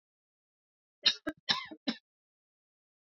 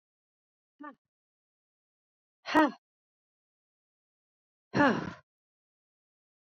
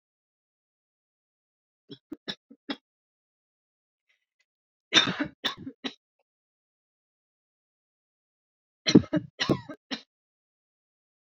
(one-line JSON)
{"cough_length": "3.1 s", "cough_amplitude": 9710, "cough_signal_mean_std_ratio": 0.23, "exhalation_length": "6.5 s", "exhalation_amplitude": 10277, "exhalation_signal_mean_std_ratio": 0.2, "three_cough_length": "11.3 s", "three_cough_amplitude": 24743, "three_cough_signal_mean_std_ratio": 0.18, "survey_phase": "beta (2021-08-13 to 2022-03-07)", "age": "45-64", "gender": "Female", "wearing_mask": "No", "symptom_none": true, "smoker_status": "Never smoked", "respiratory_condition_asthma": false, "respiratory_condition_other": false, "recruitment_source": "REACT", "submission_delay": "1 day", "covid_test_result": "Negative", "covid_test_method": "RT-qPCR"}